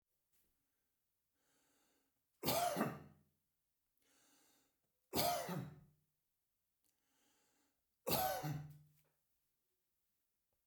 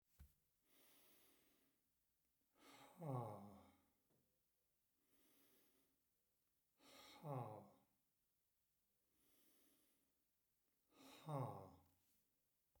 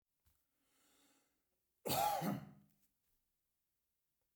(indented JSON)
{
  "three_cough_length": "10.7 s",
  "three_cough_amplitude": 2601,
  "three_cough_signal_mean_std_ratio": 0.33,
  "exhalation_length": "12.8 s",
  "exhalation_amplitude": 549,
  "exhalation_signal_mean_std_ratio": 0.33,
  "cough_length": "4.4 s",
  "cough_amplitude": 1707,
  "cough_signal_mean_std_ratio": 0.31,
  "survey_phase": "beta (2021-08-13 to 2022-03-07)",
  "age": "45-64",
  "gender": "Male",
  "wearing_mask": "No",
  "symptom_none": true,
  "smoker_status": "Ex-smoker",
  "respiratory_condition_asthma": false,
  "respiratory_condition_other": false,
  "recruitment_source": "REACT",
  "submission_delay": "1 day",
  "covid_test_result": "Negative",
  "covid_test_method": "RT-qPCR"
}